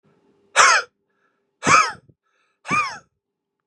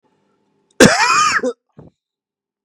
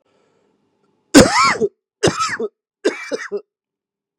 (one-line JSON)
{"exhalation_length": "3.7 s", "exhalation_amplitude": 32655, "exhalation_signal_mean_std_ratio": 0.35, "cough_length": "2.6 s", "cough_amplitude": 32768, "cough_signal_mean_std_ratio": 0.39, "three_cough_length": "4.2 s", "three_cough_amplitude": 32768, "three_cough_signal_mean_std_ratio": 0.36, "survey_phase": "beta (2021-08-13 to 2022-03-07)", "age": "18-44", "gender": "Male", "wearing_mask": "No", "symptom_cough_any": true, "symptom_fatigue": true, "smoker_status": "Never smoked", "respiratory_condition_asthma": true, "respiratory_condition_other": false, "recruitment_source": "Test and Trace", "submission_delay": "1 day", "covid_test_result": "Positive", "covid_test_method": "RT-qPCR", "covid_ct_value": 20.5, "covid_ct_gene": "ORF1ab gene", "covid_ct_mean": 21.2, "covid_viral_load": "110000 copies/ml", "covid_viral_load_category": "Low viral load (10K-1M copies/ml)"}